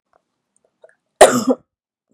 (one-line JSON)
{"cough_length": "2.1 s", "cough_amplitude": 32768, "cough_signal_mean_std_ratio": 0.26, "survey_phase": "beta (2021-08-13 to 2022-03-07)", "age": "45-64", "gender": "Female", "wearing_mask": "No", "symptom_cough_any": true, "symptom_runny_or_blocked_nose": true, "smoker_status": "Never smoked", "respiratory_condition_asthma": false, "respiratory_condition_other": false, "recruitment_source": "Test and Trace", "submission_delay": "2 days", "covid_test_result": "Positive", "covid_test_method": "RT-qPCR", "covid_ct_value": 20.2, "covid_ct_gene": "N gene"}